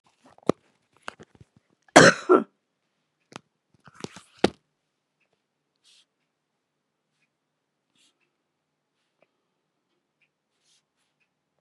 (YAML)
cough_length: 11.6 s
cough_amplitude: 32767
cough_signal_mean_std_ratio: 0.13
survey_phase: beta (2021-08-13 to 2022-03-07)
age: 45-64
gender: Female
wearing_mask: 'No'
symptom_cough_any: true
symptom_runny_or_blocked_nose: true
symptom_sore_throat: true
symptom_headache: true
symptom_onset: 2 days
smoker_status: Never smoked
respiratory_condition_asthma: false
respiratory_condition_other: false
recruitment_source: Test and Trace
submission_delay: 1 day
covid_test_result: Positive
covid_test_method: RT-qPCR
covid_ct_value: 22.2
covid_ct_gene: ORF1ab gene
covid_ct_mean: 22.5
covid_viral_load: 41000 copies/ml
covid_viral_load_category: Low viral load (10K-1M copies/ml)